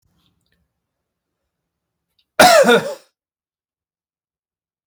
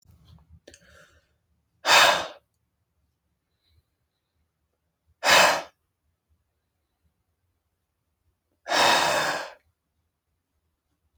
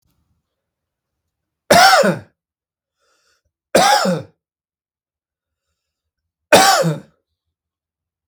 {
  "cough_length": "4.9 s",
  "cough_amplitude": 32768,
  "cough_signal_mean_std_ratio": 0.25,
  "exhalation_length": "11.2 s",
  "exhalation_amplitude": 26482,
  "exhalation_signal_mean_std_ratio": 0.28,
  "three_cough_length": "8.3 s",
  "three_cough_amplitude": 32768,
  "three_cough_signal_mean_std_ratio": 0.32,
  "survey_phase": "beta (2021-08-13 to 2022-03-07)",
  "age": "18-44",
  "gender": "Male",
  "wearing_mask": "No",
  "symptom_none": true,
  "smoker_status": "Never smoked",
  "respiratory_condition_asthma": true,
  "respiratory_condition_other": false,
  "recruitment_source": "REACT",
  "submission_delay": "2 days",
  "covid_test_result": "Negative",
  "covid_test_method": "RT-qPCR"
}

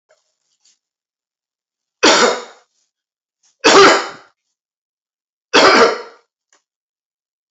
{
  "three_cough_length": "7.5 s",
  "three_cough_amplitude": 32767,
  "three_cough_signal_mean_std_ratio": 0.33,
  "survey_phase": "beta (2021-08-13 to 2022-03-07)",
  "age": "45-64",
  "gender": "Male",
  "wearing_mask": "No",
  "symptom_none": true,
  "smoker_status": "Ex-smoker",
  "respiratory_condition_asthma": false,
  "respiratory_condition_other": false,
  "recruitment_source": "REACT",
  "submission_delay": "2 days",
  "covid_test_result": "Negative",
  "covid_test_method": "RT-qPCR",
  "influenza_a_test_result": "Negative",
  "influenza_b_test_result": "Negative"
}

